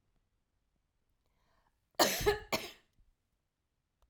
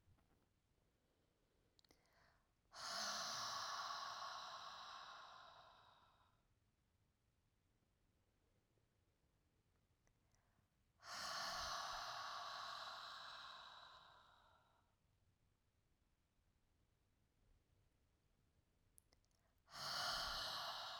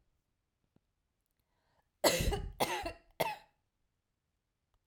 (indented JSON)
{
  "cough_length": "4.1 s",
  "cough_amplitude": 8011,
  "cough_signal_mean_std_ratio": 0.25,
  "exhalation_length": "21.0 s",
  "exhalation_amplitude": 710,
  "exhalation_signal_mean_std_ratio": 0.5,
  "three_cough_length": "4.9 s",
  "three_cough_amplitude": 7815,
  "three_cough_signal_mean_std_ratio": 0.31,
  "survey_phase": "alpha (2021-03-01 to 2021-08-12)",
  "age": "45-64",
  "gender": "Female",
  "wearing_mask": "No",
  "symptom_none": true,
  "smoker_status": "Never smoked",
  "respiratory_condition_asthma": false,
  "respiratory_condition_other": false,
  "recruitment_source": "REACT",
  "submission_delay": "2 days",
  "covid_test_result": "Negative",
  "covid_test_method": "RT-qPCR"
}